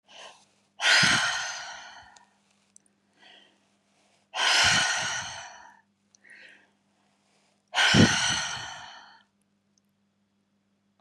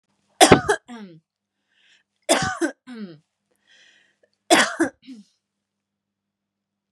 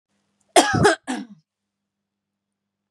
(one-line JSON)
{"exhalation_length": "11.0 s", "exhalation_amplitude": 17559, "exhalation_signal_mean_std_ratio": 0.39, "three_cough_length": "6.9 s", "three_cough_amplitude": 32768, "three_cough_signal_mean_std_ratio": 0.27, "cough_length": "2.9 s", "cough_amplitude": 32730, "cough_signal_mean_std_ratio": 0.3, "survey_phase": "beta (2021-08-13 to 2022-03-07)", "age": "18-44", "gender": "Female", "wearing_mask": "No", "symptom_cough_any": true, "symptom_runny_or_blocked_nose": true, "symptom_abdominal_pain": true, "symptom_diarrhoea": true, "symptom_fatigue": true, "symptom_onset": "12 days", "smoker_status": "Ex-smoker", "respiratory_condition_asthma": false, "respiratory_condition_other": false, "recruitment_source": "REACT", "submission_delay": "2 days", "covid_test_result": "Negative", "covid_test_method": "RT-qPCR", "influenza_a_test_result": "Negative", "influenza_b_test_result": "Negative"}